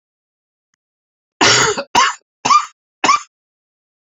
{"three_cough_length": "4.1 s", "three_cough_amplitude": 31089, "three_cough_signal_mean_std_ratio": 0.38, "survey_phase": "beta (2021-08-13 to 2022-03-07)", "age": "45-64", "gender": "Male", "wearing_mask": "No", "symptom_cough_any": true, "symptom_runny_or_blocked_nose": true, "symptom_shortness_of_breath": true, "symptom_sore_throat": true, "symptom_fever_high_temperature": true, "symptom_headache": true, "symptom_onset": "3 days", "smoker_status": "Never smoked", "respiratory_condition_asthma": true, "respiratory_condition_other": false, "recruitment_source": "Test and Trace", "submission_delay": "1 day", "covid_test_result": "Positive", "covid_test_method": "RT-qPCR", "covid_ct_value": 21.8, "covid_ct_gene": "ORF1ab gene"}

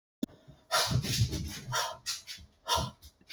{"exhalation_length": "3.3 s", "exhalation_amplitude": 6032, "exhalation_signal_mean_std_ratio": 0.59, "survey_phase": "alpha (2021-03-01 to 2021-08-12)", "age": "18-44", "gender": "Female", "wearing_mask": "Yes", "symptom_none": true, "smoker_status": "Never smoked", "respiratory_condition_asthma": false, "respiratory_condition_other": false, "recruitment_source": "REACT", "submission_delay": "1 day", "covid_test_result": "Negative", "covid_test_method": "RT-qPCR"}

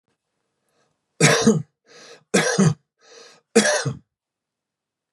{"three_cough_length": "5.1 s", "three_cough_amplitude": 26865, "three_cough_signal_mean_std_ratio": 0.37, "survey_phase": "beta (2021-08-13 to 2022-03-07)", "age": "45-64", "gender": "Male", "wearing_mask": "No", "symptom_none": true, "smoker_status": "Ex-smoker", "respiratory_condition_asthma": true, "respiratory_condition_other": false, "recruitment_source": "REACT", "submission_delay": "3 days", "covid_test_result": "Negative", "covid_test_method": "RT-qPCR", "influenza_a_test_result": "Negative", "influenza_b_test_result": "Negative"}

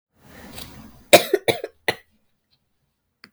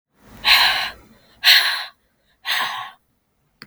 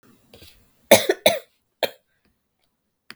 {"cough_length": "3.3 s", "cough_amplitude": 32768, "cough_signal_mean_std_ratio": 0.22, "exhalation_length": "3.7 s", "exhalation_amplitude": 32768, "exhalation_signal_mean_std_ratio": 0.43, "three_cough_length": "3.2 s", "three_cough_amplitude": 32768, "three_cough_signal_mean_std_ratio": 0.23, "survey_phase": "beta (2021-08-13 to 2022-03-07)", "age": "18-44", "gender": "Female", "wearing_mask": "No", "symptom_cough_any": true, "symptom_new_continuous_cough": true, "symptom_runny_or_blocked_nose": true, "symptom_sore_throat": true, "smoker_status": "Never smoked", "respiratory_condition_asthma": false, "respiratory_condition_other": false, "recruitment_source": "Test and Trace", "submission_delay": "2 days", "covid_test_result": "Positive", "covid_test_method": "RT-qPCR", "covid_ct_value": 25.5, "covid_ct_gene": "N gene"}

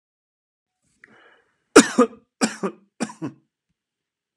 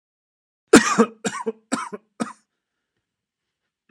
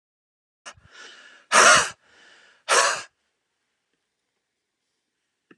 {"three_cough_length": "4.4 s", "three_cough_amplitude": 32768, "three_cough_signal_mean_std_ratio": 0.21, "cough_length": "3.9 s", "cough_amplitude": 32768, "cough_signal_mean_std_ratio": 0.25, "exhalation_length": "5.6 s", "exhalation_amplitude": 26267, "exhalation_signal_mean_std_ratio": 0.27, "survey_phase": "beta (2021-08-13 to 2022-03-07)", "age": "45-64", "gender": "Male", "wearing_mask": "No", "symptom_none": true, "smoker_status": "Never smoked", "respiratory_condition_asthma": false, "respiratory_condition_other": false, "recruitment_source": "Test and Trace", "submission_delay": "0 days", "covid_test_result": "Negative", "covid_test_method": "LFT"}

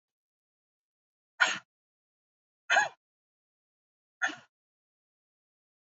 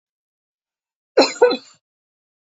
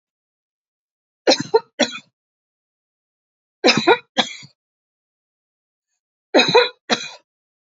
{"exhalation_length": "5.8 s", "exhalation_amplitude": 11045, "exhalation_signal_mean_std_ratio": 0.2, "cough_length": "2.6 s", "cough_amplitude": 27314, "cough_signal_mean_std_ratio": 0.25, "three_cough_length": "7.8 s", "three_cough_amplitude": 29268, "three_cough_signal_mean_std_ratio": 0.28, "survey_phase": "beta (2021-08-13 to 2022-03-07)", "age": "45-64", "gender": "Female", "wearing_mask": "No", "symptom_none": true, "smoker_status": "Never smoked", "respiratory_condition_asthma": false, "respiratory_condition_other": false, "recruitment_source": "REACT", "submission_delay": "1 day", "covid_test_result": "Negative", "covid_test_method": "RT-qPCR", "influenza_a_test_result": "Negative", "influenza_b_test_result": "Negative"}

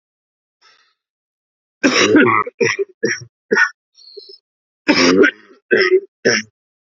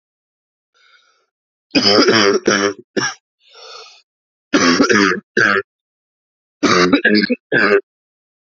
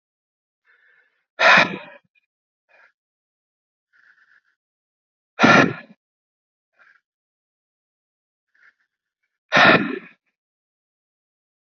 {"cough_length": "7.0 s", "cough_amplitude": 30950, "cough_signal_mean_std_ratio": 0.45, "three_cough_length": "8.5 s", "three_cough_amplitude": 32768, "three_cough_signal_mean_std_ratio": 0.49, "exhalation_length": "11.6 s", "exhalation_amplitude": 28062, "exhalation_signal_mean_std_ratio": 0.23, "survey_phase": "beta (2021-08-13 to 2022-03-07)", "age": "18-44", "gender": "Male", "wearing_mask": "No", "symptom_cough_any": true, "symptom_runny_or_blocked_nose": true, "symptom_sore_throat": true, "symptom_fatigue": true, "smoker_status": "Never smoked", "respiratory_condition_asthma": false, "respiratory_condition_other": false, "recruitment_source": "Test and Trace", "submission_delay": "2 days", "covid_test_result": "Positive", "covid_test_method": "LFT"}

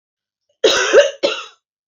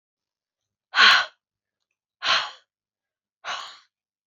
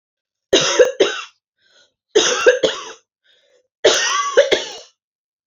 {"cough_length": "1.9 s", "cough_amplitude": 28479, "cough_signal_mean_std_ratio": 0.45, "exhalation_length": "4.3 s", "exhalation_amplitude": 25542, "exhalation_signal_mean_std_ratio": 0.28, "three_cough_length": "5.5 s", "three_cough_amplitude": 31005, "three_cough_signal_mean_std_ratio": 0.45, "survey_phase": "beta (2021-08-13 to 2022-03-07)", "age": "18-44", "gender": "Female", "wearing_mask": "No", "symptom_fatigue": true, "symptom_headache": true, "symptom_other": true, "symptom_onset": "8 days", "smoker_status": "Never smoked", "respiratory_condition_asthma": false, "respiratory_condition_other": false, "recruitment_source": "REACT", "submission_delay": "2 days", "covid_test_result": "Negative", "covid_test_method": "RT-qPCR", "influenza_a_test_result": "Negative", "influenza_b_test_result": "Negative"}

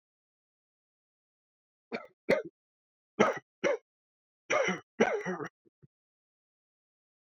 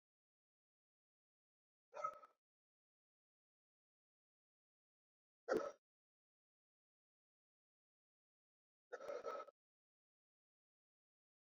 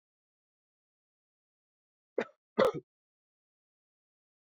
{"three_cough_length": "7.3 s", "three_cough_amplitude": 12283, "three_cough_signal_mean_std_ratio": 0.3, "exhalation_length": "11.5 s", "exhalation_amplitude": 1346, "exhalation_signal_mean_std_ratio": 0.19, "cough_length": "4.5 s", "cough_amplitude": 7931, "cough_signal_mean_std_ratio": 0.16, "survey_phase": "beta (2021-08-13 to 2022-03-07)", "age": "18-44", "gender": "Male", "wearing_mask": "Yes", "symptom_runny_or_blocked_nose": true, "smoker_status": "Never smoked", "respiratory_condition_asthma": false, "respiratory_condition_other": false, "recruitment_source": "Test and Trace", "submission_delay": "-1 day", "covid_test_result": "Negative", "covid_test_method": "LFT"}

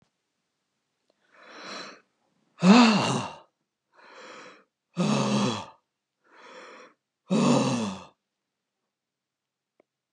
{"exhalation_length": "10.1 s", "exhalation_amplitude": 20153, "exhalation_signal_mean_std_ratio": 0.35, "survey_phase": "beta (2021-08-13 to 2022-03-07)", "age": "65+", "gender": "Male", "wearing_mask": "No", "symptom_none": true, "smoker_status": "Ex-smoker", "respiratory_condition_asthma": false, "respiratory_condition_other": false, "recruitment_source": "REACT", "submission_delay": "2 days", "covid_test_result": "Negative", "covid_test_method": "RT-qPCR"}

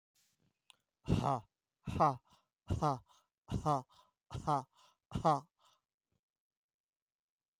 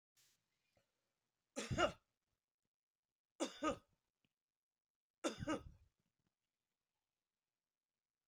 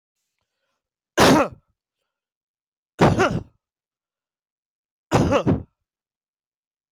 {"exhalation_length": "7.6 s", "exhalation_amplitude": 3947, "exhalation_signal_mean_std_ratio": 0.34, "three_cough_length": "8.3 s", "three_cough_amplitude": 2198, "three_cough_signal_mean_std_ratio": 0.24, "cough_length": "6.9 s", "cough_amplitude": 22430, "cough_signal_mean_std_ratio": 0.32, "survey_phase": "alpha (2021-03-01 to 2021-08-12)", "age": "65+", "gender": "Male", "wearing_mask": "No", "symptom_none": true, "smoker_status": "Never smoked", "respiratory_condition_asthma": true, "respiratory_condition_other": false, "recruitment_source": "REACT", "submission_delay": "1 day", "covid_test_result": "Negative", "covid_test_method": "RT-qPCR"}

